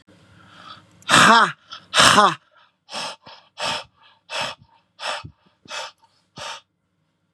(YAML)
exhalation_length: 7.3 s
exhalation_amplitude: 32768
exhalation_signal_mean_std_ratio: 0.33
survey_phase: beta (2021-08-13 to 2022-03-07)
age: 45-64
gender: Male
wearing_mask: 'No'
symptom_none: true
smoker_status: Ex-smoker
respiratory_condition_asthma: false
respiratory_condition_other: false
recruitment_source: REACT
submission_delay: 2 days
covid_test_result: Negative
covid_test_method: RT-qPCR
influenza_a_test_result: Negative
influenza_b_test_result: Negative